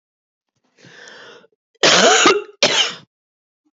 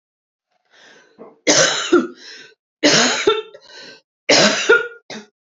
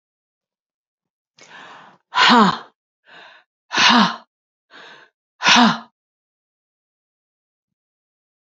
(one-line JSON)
{"cough_length": "3.8 s", "cough_amplitude": 32768, "cough_signal_mean_std_ratio": 0.4, "three_cough_length": "5.5 s", "three_cough_amplitude": 32767, "three_cough_signal_mean_std_ratio": 0.46, "exhalation_length": "8.4 s", "exhalation_amplitude": 30183, "exhalation_signal_mean_std_ratio": 0.3, "survey_phase": "beta (2021-08-13 to 2022-03-07)", "age": "45-64", "gender": "Female", "wearing_mask": "No", "symptom_cough_any": true, "symptom_headache": true, "symptom_other": true, "smoker_status": "Ex-smoker", "respiratory_condition_asthma": false, "respiratory_condition_other": false, "recruitment_source": "Test and Trace", "submission_delay": "1 day", "covid_test_result": "Positive", "covid_test_method": "RT-qPCR", "covid_ct_value": 18.0, "covid_ct_gene": "ORF1ab gene", "covid_ct_mean": 18.4, "covid_viral_load": "930000 copies/ml", "covid_viral_load_category": "Low viral load (10K-1M copies/ml)"}